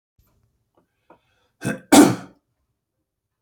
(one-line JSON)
{"cough_length": "3.4 s", "cough_amplitude": 30856, "cough_signal_mean_std_ratio": 0.22, "survey_phase": "beta (2021-08-13 to 2022-03-07)", "age": "65+", "gender": "Male", "wearing_mask": "No", "symptom_none": true, "smoker_status": "Never smoked", "respiratory_condition_asthma": true, "respiratory_condition_other": false, "recruitment_source": "REACT", "submission_delay": "2 days", "covid_test_result": "Negative", "covid_test_method": "RT-qPCR", "influenza_a_test_result": "Negative", "influenza_b_test_result": "Negative"}